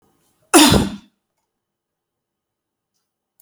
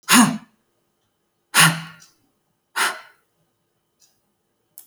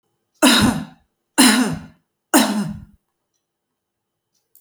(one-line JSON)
{"cough_length": "3.4 s", "cough_amplitude": 32767, "cough_signal_mean_std_ratio": 0.25, "exhalation_length": "4.9 s", "exhalation_amplitude": 32156, "exhalation_signal_mean_std_ratio": 0.28, "three_cough_length": "4.6 s", "three_cough_amplitude": 32768, "three_cough_signal_mean_std_ratio": 0.4, "survey_phase": "beta (2021-08-13 to 2022-03-07)", "age": "45-64", "gender": "Female", "wearing_mask": "No", "symptom_none": true, "smoker_status": "Never smoked", "respiratory_condition_asthma": false, "respiratory_condition_other": false, "recruitment_source": "REACT", "submission_delay": "2 days", "covid_test_result": "Negative", "covid_test_method": "RT-qPCR"}